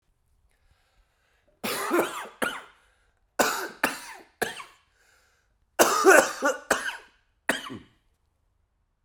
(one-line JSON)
{"three_cough_length": "9.0 s", "three_cough_amplitude": 28989, "three_cough_signal_mean_std_ratio": 0.34, "survey_phase": "beta (2021-08-13 to 2022-03-07)", "age": "45-64", "gender": "Male", "wearing_mask": "Yes", "symptom_cough_any": true, "symptom_runny_or_blocked_nose": true, "symptom_sore_throat": true, "symptom_abdominal_pain": true, "symptom_fatigue": true, "symptom_headache": true, "symptom_change_to_sense_of_smell_or_taste": true, "symptom_onset": "3 days", "smoker_status": "Never smoked", "respiratory_condition_asthma": true, "respiratory_condition_other": false, "recruitment_source": "Test and Trace", "submission_delay": "1 day", "covid_test_result": "Positive", "covid_test_method": "RT-qPCR", "covid_ct_value": 13.6, "covid_ct_gene": "ORF1ab gene", "covid_ct_mean": 13.9, "covid_viral_load": "27000000 copies/ml", "covid_viral_load_category": "High viral load (>1M copies/ml)"}